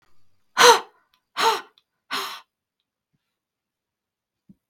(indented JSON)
{
  "exhalation_length": "4.7 s",
  "exhalation_amplitude": 32766,
  "exhalation_signal_mean_std_ratio": 0.24,
  "survey_phase": "beta (2021-08-13 to 2022-03-07)",
  "age": "45-64",
  "gender": "Female",
  "wearing_mask": "No",
  "symptom_none": true,
  "smoker_status": "Never smoked",
  "respiratory_condition_asthma": false,
  "respiratory_condition_other": false,
  "recruitment_source": "REACT",
  "submission_delay": "3 days",
  "covid_test_result": "Negative",
  "covid_test_method": "RT-qPCR",
  "influenza_a_test_result": "Negative",
  "influenza_b_test_result": "Negative"
}